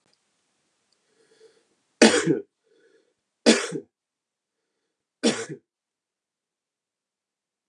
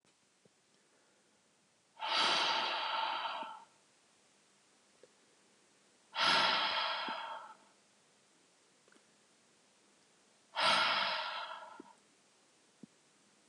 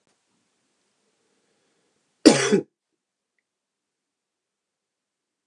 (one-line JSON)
{"three_cough_length": "7.7 s", "three_cough_amplitude": 31170, "three_cough_signal_mean_std_ratio": 0.22, "exhalation_length": "13.5 s", "exhalation_amplitude": 4345, "exhalation_signal_mean_std_ratio": 0.44, "cough_length": "5.5 s", "cough_amplitude": 32768, "cough_signal_mean_std_ratio": 0.17, "survey_phase": "beta (2021-08-13 to 2022-03-07)", "age": "18-44", "gender": "Male", "wearing_mask": "No", "symptom_cough_any": true, "symptom_sore_throat": true, "symptom_fatigue": true, "symptom_fever_high_temperature": true, "symptom_headache": true, "symptom_change_to_sense_of_smell_or_taste": true, "symptom_onset": "3 days", "smoker_status": "Never smoked", "respiratory_condition_asthma": false, "respiratory_condition_other": false, "recruitment_source": "Test and Trace", "submission_delay": "1 day", "covid_test_result": "Positive", "covid_test_method": "RT-qPCR", "covid_ct_value": 24.8, "covid_ct_gene": "N gene"}